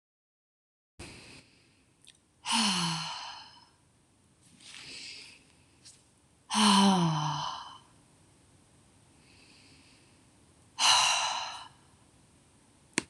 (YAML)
exhalation_length: 13.1 s
exhalation_amplitude: 10405
exhalation_signal_mean_std_ratio: 0.38
survey_phase: beta (2021-08-13 to 2022-03-07)
age: 18-44
gender: Female
wearing_mask: 'No'
symptom_runny_or_blocked_nose: true
symptom_fatigue: true
symptom_headache: true
symptom_other: true
symptom_onset: 3 days
smoker_status: Never smoked
respiratory_condition_asthma: false
respiratory_condition_other: false
recruitment_source: Test and Trace
submission_delay: 2 days
covid_test_result: Positive
covid_test_method: ePCR